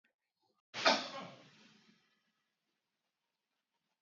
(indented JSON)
{
  "cough_length": "4.0 s",
  "cough_amplitude": 5182,
  "cough_signal_mean_std_ratio": 0.22,
  "survey_phase": "beta (2021-08-13 to 2022-03-07)",
  "age": "45-64",
  "gender": "Male",
  "wearing_mask": "No",
  "symptom_runny_or_blocked_nose": true,
  "symptom_shortness_of_breath": true,
  "symptom_fatigue": true,
  "symptom_headache": true,
  "symptom_other": true,
  "smoker_status": "Never smoked",
  "respiratory_condition_asthma": true,
  "respiratory_condition_other": false,
  "recruitment_source": "Test and Trace",
  "submission_delay": "1 day",
  "covid_test_result": "Positive",
  "covid_test_method": "RT-qPCR",
  "covid_ct_value": 21.6,
  "covid_ct_gene": "ORF1ab gene"
}